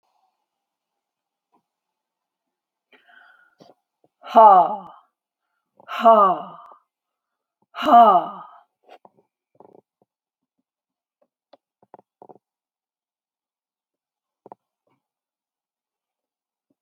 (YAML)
exhalation_length: 16.8 s
exhalation_amplitude: 27899
exhalation_signal_mean_std_ratio: 0.21
survey_phase: alpha (2021-03-01 to 2021-08-12)
age: 45-64
gender: Female
wearing_mask: 'No'
symptom_none: true
smoker_status: Never smoked
respiratory_condition_asthma: false
respiratory_condition_other: false
recruitment_source: REACT
submission_delay: 1 day
covid_test_result: Negative
covid_test_method: RT-qPCR